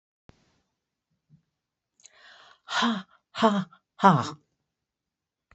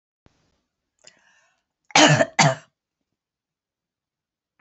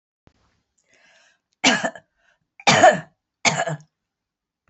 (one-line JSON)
{"exhalation_length": "5.5 s", "exhalation_amplitude": 20946, "exhalation_signal_mean_std_ratio": 0.28, "cough_length": "4.6 s", "cough_amplitude": 28726, "cough_signal_mean_std_ratio": 0.24, "three_cough_length": "4.7 s", "three_cough_amplitude": 30175, "three_cough_signal_mean_std_ratio": 0.3, "survey_phase": "beta (2021-08-13 to 2022-03-07)", "age": "65+", "gender": "Female", "wearing_mask": "No", "symptom_cough_any": true, "symptom_runny_or_blocked_nose": true, "symptom_fatigue": true, "symptom_headache": true, "symptom_onset": "5 days", "smoker_status": "Ex-smoker", "respiratory_condition_asthma": false, "respiratory_condition_other": false, "recruitment_source": "Test and Trace", "submission_delay": "1 day", "covid_test_result": "Positive", "covid_test_method": "RT-qPCR", "covid_ct_value": 27.4, "covid_ct_gene": "N gene"}